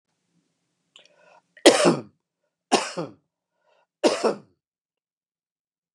{"three_cough_length": "5.9 s", "three_cough_amplitude": 32768, "three_cough_signal_mean_std_ratio": 0.26, "survey_phase": "beta (2021-08-13 to 2022-03-07)", "age": "65+", "gender": "Male", "wearing_mask": "No", "symptom_none": true, "smoker_status": "Never smoked", "respiratory_condition_asthma": false, "respiratory_condition_other": false, "recruitment_source": "REACT", "submission_delay": "1 day", "covid_test_result": "Negative", "covid_test_method": "RT-qPCR", "influenza_a_test_result": "Negative", "influenza_b_test_result": "Negative"}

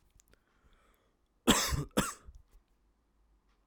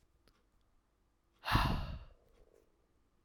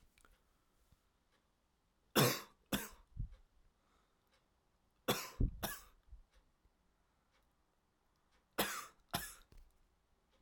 {"cough_length": "3.7 s", "cough_amplitude": 9617, "cough_signal_mean_std_ratio": 0.28, "exhalation_length": "3.2 s", "exhalation_amplitude": 5117, "exhalation_signal_mean_std_ratio": 0.32, "three_cough_length": "10.4 s", "three_cough_amplitude": 4420, "three_cough_signal_mean_std_ratio": 0.27, "survey_phase": "alpha (2021-03-01 to 2021-08-12)", "age": "18-44", "gender": "Male", "wearing_mask": "No", "symptom_shortness_of_breath": true, "symptom_abdominal_pain": true, "symptom_fatigue": true, "symptom_fever_high_temperature": true, "symptom_headache": true, "symptom_onset": "3 days", "smoker_status": "Never smoked", "respiratory_condition_asthma": false, "respiratory_condition_other": false, "recruitment_source": "Test and Trace", "submission_delay": "2 days", "covid_test_result": "Positive", "covid_test_method": "RT-qPCR", "covid_ct_value": 14.6, "covid_ct_gene": "ORF1ab gene", "covid_ct_mean": 15.1, "covid_viral_load": "11000000 copies/ml", "covid_viral_load_category": "High viral load (>1M copies/ml)"}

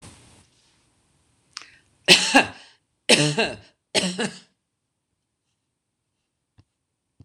{"three_cough_length": "7.2 s", "three_cough_amplitude": 26028, "three_cough_signal_mean_std_ratio": 0.27, "survey_phase": "beta (2021-08-13 to 2022-03-07)", "age": "45-64", "gender": "Female", "wearing_mask": "No", "symptom_none": true, "smoker_status": "Current smoker (1 to 10 cigarettes per day)", "respiratory_condition_asthma": false, "respiratory_condition_other": false, "recruitment_source": "REACT", "submission_delay": "0 days", "covid_test_result": "Negative", "covid_test_method": "RT-qPCR"}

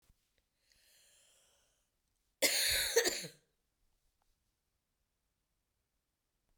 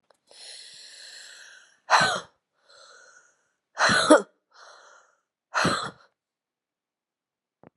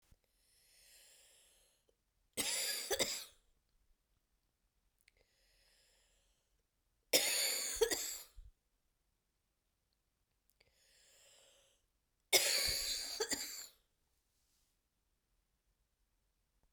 {"cough_length": "6.6 s", "cough_amplitude": 6329, "cough_signal_mean_std_ratio": 0.27, "exhalation_length": "7.8 s", "exhalation_amplitude": 26966, "exhalation_signal_mean_std_ratio": 0.29, "three_cough_length": "16.7 s", "three_cough_amplitude": 5980, "three_cough_signal_mean_std_ratio": 0.32, "survey_phase": "beta (2021-08-13 to 2022-03-07)", "age": "65+", "gender": "Female", "wearing_mask": "No", "symptom_cough_any": true, "symptom_new_continuous_cough": true, "symptom_shortness_of_breath": true, "symptom_fatigue": true, "symptom_headache": true, "symptom_change_to_sense_of_smell_or_taste": true, "symptom_loss_of_taste": true, "symptom_onset": "4 days", "smoker_status": "Never smoked", "respiratory_condition_asthma": true, "respiratory_condition_other": false, "recruitment_source": "Test and Trace", "submission_delay": "1 day", "covid_test_result": "Positive", "covid_test_method": "RT-qPCR", "covid_ct_value": 19.1, "covid_ct_gene": "N gene"}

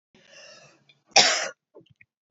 {"cough_length": "2.3 s", "cough_amplitude": 27866, "cough_signal_mean_std_ratio": 0.27, "survey_phase": "beta (2021-08-13 to 2022-03-07)", "age": "18-44", "gender": "Female", "wearing_mask": "No", "symptom_runny_or_blocked_nose": true, "symptom_sore_throat": true, "symptom_fatigue": true, "symptom_headache": true, "smoker_status": "Never smoked", "respiratory_condition_asthma": true, "respiratory_condition_other": false, "recruitment_source": "Test and Trace", "submission_delay": "2 days", "covid_test_result": "Positive", "covid_test_method": "RT-qPCR", "covid_ct_value": 22.5, "covid_ct_gene": "N gene"}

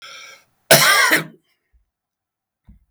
{"cough_length": "2.9 s", "cough_amplitude": 32768, "cough_signal_mean_std_ratio": 0.35, "survey_phase": "beta (2021-08-13 to 2022-03-07)", "age": "65+", "gender": "Male", "wearing_mask": "No", "symptom_none": true, "smoker_status": "Ex-smoker", "respiratory_condition_asthma": false, "respiratory_condition_other": false, "recruitment_source": "REACT", "submission_delay": "2 days", "covid_test_result": "Negative", "covid_test_method": "RT-qPCR", "influenza_a_test_result": "Unknown/Void", "influenza_b_test_result": "Unknown/Void"}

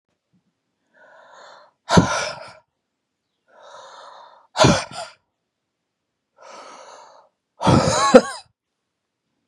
{"exhalation_length": "9.5 s", "exhalation_amplitude": 32768, "exhalation_signal_mean_std_ratio": 0.28, "survey_phase": "beta (2021-08-13 to 2022-03-07)", "age": "45-64", "gender": "Female", "wearing_mask": "No", "symptom_fatigue": true, "symptom_headache": true, "symptom_onset": "8 days", "smoker_status": "Ex-smoker", "respiratory_condition_asthma": false, "respiratory_condition_other": false, "recruitment_source": "REACT", "submission_delay": "0 days", "covid_test_result": "Negative", "covid_test_method": "RT-qPCR", "influenza_a_test_result": "Negative", "influenza_b_test_result": "Negative"}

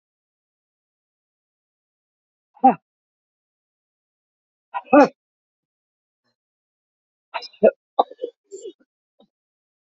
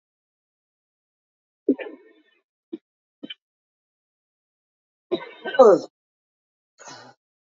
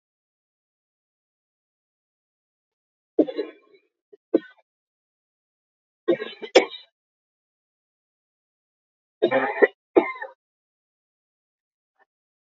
{"exhalation_length": "10.0 s", "exhalation_amplitude": 28693, "exhalation_signal_mean_std_ratio": 0.16, "cough_length": "7.6 s", "cough_amplitude": 27371, "cough_signal_mean_std_ratio": 0.18, "three_cough_length": "12.5 s", "three_cough_amplitude": 30541, "three_cough_signal_mean_std_ratio": 0.19, "survey_phase": "beta (2021-08-13 to 2022-03-07)", "age": "65+", "gender": "Female", "wearing_mask": "No", "symptom_cough_any": true, "symptom_runny_or_blocked_nose": true, "symptom_fatigue": true, "symptom_headache": true, "symptom_change_to_sense_of_smell_or_taste": true, "symptom_loss_of_taste": true, "smoker_status": "Never smoked", "respiratory_condition_asthma": false, "respiratory_condition_other": false, "recruitment_source": "Test and Trace", "submission_delay": "1 day", "covid_test_result": "Positive", "covid_test_method": "RT-qPCR", "covid_ct_value": 13.9, "covid_ct_gene": "ORF1ab gene", "covid_ct_mean": 14.2, "covid_viral_load": "22000000 copies/ml", "covid_viral_load_category": "High viral load (>1M copies/ml)"}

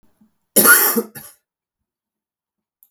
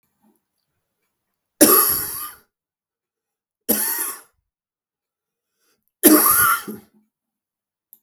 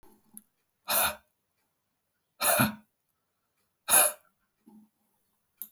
{"cough_length": "2.9 s", "cough_amplitude": 32768, "cough_signal_mean_std_ratio": 0.31, "three_cough_length": "8.0 s", "three_cough_amplitude": 32768, "three_cough_signal_mean_std_ratio": 0.33, "exhalation_length": "5.7 s", "exhalation_amplitude": 13553, "exhalation_signal_mean_std_ratio": 0.29, "survey_phase": "beta (2021-08-13 to 2022-03-07)", "age": "45-64", "gender": "Male", "wearing_mask": "No", "symptom_cough_any": true, "symptom_runny_or_blocked_nose": true, "symptom_fatigue": true, "symptom_fever_high_temperature": true, "symptom_headache": true, "symptom_other": true, "smoker_status": "Ex-smoker", "respiratory_condition_asthma": false, "respiratory_condition_other": false, "recruitment_source": "Test and Trace", "submission_delay": "1 day", "covid_test_result": "Positive", "covid_test_method": "RT-qPCR", "covid_ct_value": 20.6, "covid_ct_gene": "ORF1ab gene", "covid_ct_mean": 20.8, "covid_viral_load": "150000 copies/ml", "covid_viral_load_category": "Low viral load (10K-1M copies/ml)"}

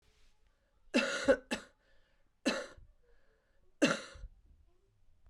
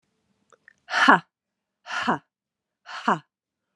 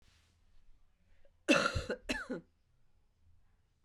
{"three_cough_length": "5.3 s", "three_cough_amplitude": 6402, "three_cough_signal_mean_std_ratio": 0.31, "exhalation_length": "3.8 s", "exhalation_amplitude": 32599, "exhalation_signal_mean_std_ratio": 0.28, "cough_length": "3.8 s", "cough_amplitude": 7323, "cough_signal_mean_std_ratio": 0.32, "survey_phase": "beta (2021-08-13 to 2022-03-07)", "age": "18-44", "gender": "Female", "wearing_mask": "No", "symptom_cough_any": true, "symptom_runny_or_blocked_nose": true, "symptom_sore_throat": true, "symptom_change_to_sense_of_smell_or_taste": true, "symptom_loss_of_taste": true, "symptom_onset": "4 days", "smoker_status": "Never smoked", "respiratory_condition_asthma": false, "respiratory_condition_other": false, "recruitment_source": "Test and Trace", "submission_delay": "1 day", "covid_test_result": "Positive", "covid_test_method": "ePCR"}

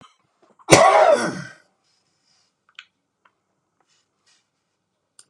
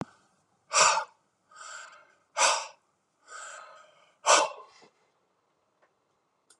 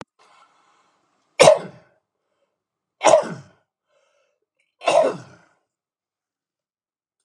{"cough_length": "5.3 s", "cough_amplitude": 32768, "cough_signal_mean_std_ratio": 0.27, "exhalation_length": "6.6 s", "exhalation_amplitude": 14383, "exhalation_signal_mean_std_ratio": 0.3, "three_cough_length": "7.2 s", "three_cough_amplitude": 32768, "three_cough_signal_mean_std_ratio": 0.24, "survey_phase": "beta (2021-08-13 to 2022-03-07)", "age": "65+", "gender": "Male", "wearing_mask": "No", "symptom_none": true, "smoker_status": "Never smoked", "respiratory_condition_asthma": false, "respiratory_condition_other": false, "recruitment_source": "REACT", "submission_delay": "5 days", "covid_test_result": "Negative", "covid_test_method": "RT-qPCR", "influenza_a_test_result": "Negative", "influenza_b_test_result": "Negative"}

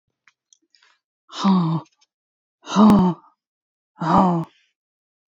{"exhalation_length": "5.3 s", "exhalation_amplitude": 24544, "exhalation_signal_mean_std_ratio": 0.41, "survey_phase": "beta (2021-08-13 to 2022-03-07)", "age": "45-64", "gender": "Female", "wearing_mask": "No", "symptom_shortness_of_breath": true, "smoker_status": "Ex-smoker", "respiratory_condition_asthma": true, "respiratory_condition_other": false, "recruitment_source": "Test and Trace", "submission_delay": "1 day", "covid_test_result": "Negative", "covid_test_method": "RT-qPCR"}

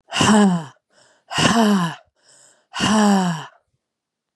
{"exhalation_length": "4.4 s", "exhalation_amplitude": 29292, "exhalation_signal_mean_std_ratio": 0.56, "survey_phase": "beta (2021-08-13 to 2022-03-07)", "age": "45-64", "gender": "Female", "wearing_mask": "No", "symptom_cough_any": true, "symptom_runny_or_blocked_nose": true, "symptom_sore_throat": true, "symptom_fatigue": true, "symptom_other": true, "symptom_onset": "2 days", "smoker_status": "Ex-smoker", "respiratory_condition_asthma": false, "respiratory_condition_other": false, "recruitment_source": "Test and Trace", "submission_delay": "1 day", "covid_test_result": "Positive", "covid_test_method": "RT-qPCR", "covid_ct_value": 26.5, "covid_ct_gene": "ORF1ab gene"}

